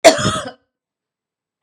{"cough_length": "1.6 s", "cough_amplitude": 32768, "cough_signal_mean_std_ratio": 0.31, "survey_phase": "beta (2021-08-13 to 2022-03-07)", "age": "18-44", "gender": "Female", "wearing_mask": "No", "symptom_cough_any": true, "symptom_runny_or_blocked_nose": true, "symptom_fatigue": true, "smoker_status": "Never smoked", "respiratory_condition_asthma": false, "respiratory_condition_other": false, "recruitment_source": "Test and Trace", "submission_delay": "2 days", "covid_test_result": "Negative", "covid_test_method": "ePCR"}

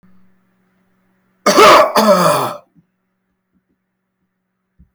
{"cough_length": "4.9 s", "cough_amplitude": 32768, "cough_signal_mean_std_ratio": 0.37, "survey_phase": "beta (2021-08-13 to 2022-03-07)", "age": "65+", "gender": "Male", "wearing_mask": "No", "symptom_cough_any": true, "smoker_status": "Ex-smoker", "respiratory_condition_asthma": false, "respiratory_condition_other": false, "recruitment_source": "REACT", "submission_delay": "3 days", "covid_test_result": "Negative", "covid_test_method": "RT-qPCR", "influenza_a_test_result": "Negative", "influenza_b_test_result": "Negative"}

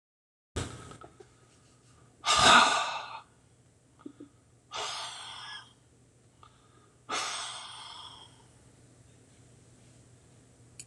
{"exhalation_length": "10.9 s", "exhalation_amplitude": 14950, "exhalation_signal_mean_std_ratio": 0.3, "survey_phase": "beta (2021-08-13 to 2022-03-07)", "age": "65+", "gender": "Male", "wearing_mask": "No", "symptom_cough_any": true, "symptom_runny_or_blocked_nose": true, "smoker_status": "Ex-smoker", "respiratory_condition_asthma": false, "respiratory_condition_other": true, "recruitment_source": "Test and Trace", "submission_delay": "1 day", "covid_test_result": "Negative", "covid_test_method": "RT-qPCR"}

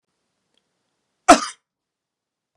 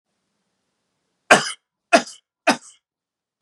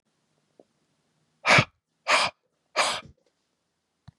{"cough_length": "2.6 s", "cough_amplitude": 32768, "cough_signal_mean_std_ratio": 0.16, "three_cough_length": "3.4 s", "three_cough_amplitude": 32768, "three_cough_signal_mean_std_ratio": 0.22, "exhalation_length": "4.2 s", "exhalation_amplitude": 17073, "exhalation_signal_mean_std_ratio": 0.29, "survey_phase": "beta (2021-08-13 to 2022-03-07)", "age": "45-64", "gender": "Male", "wearing_mask": "No", "symptom_none": true, "smoker_status": "Never smoked", "respiratory_condition_asthma": false, "respiratory_condition_other": false, "recruitment_source": "REACT", "submission_delay": "1 day", "covid_test_result": "Negative", "covid_test_method": "RT-qPCR"}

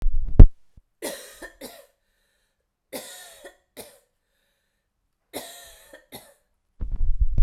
{"three_cough_length": "7.4 s", "three_cough_amplitude": 32768, "three_cough_signal_mean_std_ratio": 0.25, "survey_phase": "beta (2021-08-13 to 2022-03-07)", "age": "18-44", "gender": "Female", "wearing_mask": "No", "symptom_runny_or_blocked_nose": true, "symptom_sore_throat": true, "symptom_headache": true, "symptom_onset": "4 days", "smoker_status": "Ex-smoker", "respiratory_condition_asthma": false, "respiratory_condition_other": false, "recruitment_source": "Test and Trace", "submission_delay": "2 days", "covid_test_result": "Positive", "covid_test_method": "RT-qPCR", "covid_ct_value": 28.9, "covid_ct_gene": "N gene"}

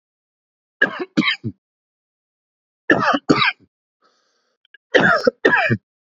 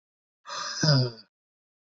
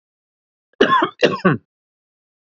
{"three_cough_length": "6.1 s", "three_cough_amplitude": 27777, "three_cough_signal_mean_std_ratio": 0.39, "exhalation_length": "2.0 s", "exhalation_amplitude": 13040, "exhalation_signal_mean_std_ratio": 0.4, "cough_length": "2.6 s", "cough_amplitude": 28577, "cough_signal_mean_std_ratio": 0.36, "survey_phase": "beta (2021-08-13 to 2022-03-07)", "age": "65+", "gender": "Male", "wearing_mask": "No", "symptom_none": true, "smoker_status": "Never smoked", "respiratory_condition_asthma": true, "respiratory_condition_other": false, "recruitment_source": "REACT", "submission_delay": "16 days", "covid_test_result": "Negative", "covid_test_method": "RT-qPCR", "influenza_a_test_result": "Negative", "influenza_b_test_result": "Negative"}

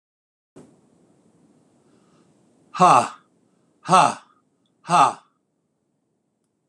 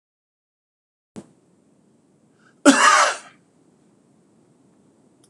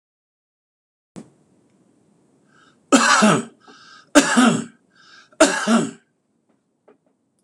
{"exhalation_length": "6.7 s", "exhalation_amplitude": 25928, "exhalation_signal_mean_std_ratio": 0.25, "cough_length": "5.3 s", "cough_amplitude": 26028, "cough_signal_mean_std_ratio": 0.25, "three_cough_length": "7.4 s", "three_cough_amplitude": 26028, "three_cough_signal_mean_std_ratio": 0.34, "survey_phase": "alpha (2021-03-01 to 2021-08-12)", "age": "65+", "gender": "Male", "wearing_mask": "No", "symptom_none": true, "smoker_status": "Ex-smoker", "respiratory_condition_asthma": false, "respiratory_condition_other": false, "recruitment_source": "REACT", "submission_delay": "2 days", "covid_test_result": "Negative", "covid_test_method": "RT-qPCR"}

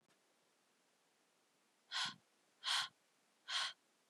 {"exhalation_length": "4.1 s", "exhalation_amplitude": 2129, "exhalation_signal_mean_std_ratio": 0.34, "survey_phase": "beta (2021-08-13 to 2022-03-07)", "age": "18-44", "gender": "Female", "wearing_mask": "No", "symptom_cough_any": true, "symptom_onset": "5 days", "smoker_status": "Never smoked", "respiratory_condition_asthma": true, "respiratory_condition_other": false, "recruitment_source": "Test and Trace", "submission_delay": "1 day", "covid_test_result": "Positive", "covid_test_method": "RT-qPCR", "covid_ct_value": 21.7, "covid_ct_gene": "ORF1ab gene", "covid_ct_mean": 22.0, "covid_viral_load": "61000 copies/ml", "covid_viral_load_category": "Low viral load (10K-1M copies/ml)"}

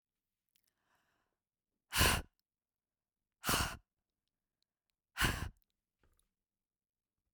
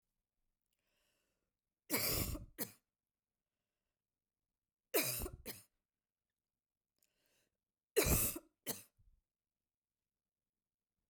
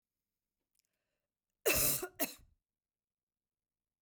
{"exhalation_length": "7.3 s", "exhalation_amplitude": 5338, "exhalation_signal_mean_std_ratio": 0.25, "three_cough_length": "11.1 s", "three_cough_amplitude": 3276, "three_cough_signal_mean_std_ratio": 0.28, "cough_length": "4.0 s", "cough_amplitude": 4316, "cough_signal_mean_std_ratio": 0.27, "survey_phase": "beta (2021-08-13 to 2022-03-07)", "age": "18-44", "gender": "Female", "wearing_mask": "No", "symptom_none": true, "smoker_status": "Never smoked", "respiratory_condition_asthma": false, "respiratory_condition_other": false, "recruitment_source": "REACT", "submission_delay": "2 days", "covid_test_result": "Negative", "covid_test_method": "RT-qPCR", "influenza_a_test_result": "Negative", "influenza_b_test_result": "Negative"}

